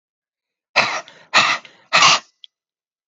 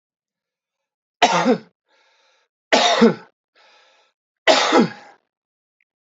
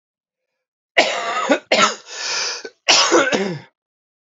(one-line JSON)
{"exhalation_length": "3.1 s", "exhalation_amplitude": 32767, "exhalation_signal_mean_std_ratio": 0.38, "three_cough_length": "6.1 s", "three_cough_amplitude": 30099, "three_cough_signal_mean_std_ratio": 0.35, "cough_length": "4.4 s", "cough_amplitude": 32316, "cough_signal_mean_std_ratio": 0.52, "survey_phase": "alpha (2021-03-01 to 2021-08-12)", "age": "45-64", "gender": "Male", "wearing_mask": "No", "symptom_cough_any": true, "symptom_fatigue": true, "smoker_status": "Never smoked", "respiratory_condition_asthma": false, "respiratory_condition_other": false, "recruitment_source": "Test and Trace", "submission_delay": "1 day", "covid_test_result": "Positive", "covid_test_method": "RT-qPCR", "covid_ct_value": 18.6, "covid_ct_gene": "ORF1ab gene", "covid_ct_mean": 19.0, "covid_viral_load": "580000 copies/ml", "covid_viral_load_category": "Low viral load (10K-1M copies/ml)"}